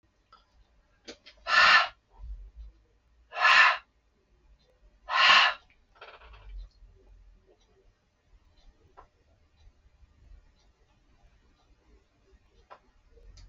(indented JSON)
{
  "exhalation_length": "13.5 s",
  "exhalation_amplitude": 14613,
  "exhalation_signal_mean_std_ratio": 0.27,
  "survey_phase": "beta (2021-08-13 to 2022-03-07)",
  "age": "45-64",
  "gender": "Male",
  "wearing_mask": "No",
  "symptom_cough_any": true,
  "symptom_runny_or_blocked_nose": true,
  "smoker_status": "Never smoked",
  "respiratory_condition_asthma": false,
  "respiratory_condition_other": false,
  "recruitment_source": "REACT",
  "submission_delay": "3 days",
  "covid_test_result": "Negative",
  "covid_test_method": "RT-qPCR"
}